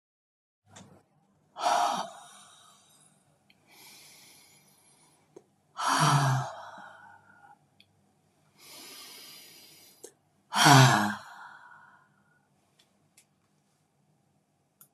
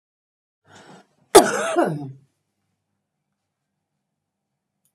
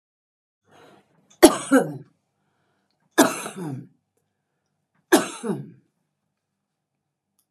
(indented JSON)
{
  "exhalation_length": "14.9 s",
  "exhalation_amplitude": 19331,
  "exhalation_signal_mean_std_ratio": 0.28,
  "cough_length": "4.9 s",
  "cough_amplitude": 32768,
  "cough_signal_mean_std_ratio": 0.22,
  "three_cough_length": "7.5 s",
  "three_cough_amplitude": 32767,
  "three_cough_signal_mean_std_ratio": 0.24,
  "survey_phase": "beta (2021-08-13 to 2022-03-07)",
  "age": "65+",
  "gender": "Female",
  "wearing_mask": "No",
  "symptom_none": true,
  "smoker_status": "Never smoked",
  "respiratory_condition_asthma": false,
  "respiratory_condition_other": false,
  "recruitment_source": "REACT",
  "submission_delay": "2 days",
  "covid_test_result": "Negative",
  "covid_test_method": "RT-qPCR"
}